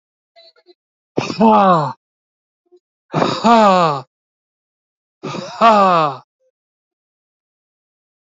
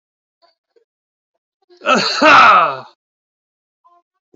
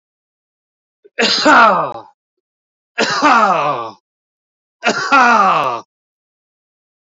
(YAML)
exhalation_length: 8.3 s
exhalation_amplitude: 28636
exhalation_signal_mean_std_ratio: 0.39
cough_length: 4.4 s
cough_amplitude: 29120
cough_signal_mean_std_ratio: 0.36
three_cough_length: 7.2 s
three_cough_amplitude: 30921
three_cough_signal_mean_std_ratio: 0.49
survey_phase: beta (2021-08-13 to 2022-03-07)
age: 45-64
gender: Male
wearing_mask: 'No'
symptom_fatigue: true
symptom_onset: 12 days
smoker_status: Never smoked
respiratory_condition_asthma: true
respiratory_condition_other: false
recruitment_source: REACT
submission_delay: 1 day
covid_test_result: Negative
covid_test_method: RT-qPCR
influenza_a_test_result: Negative
influenza_b_test_result: Negative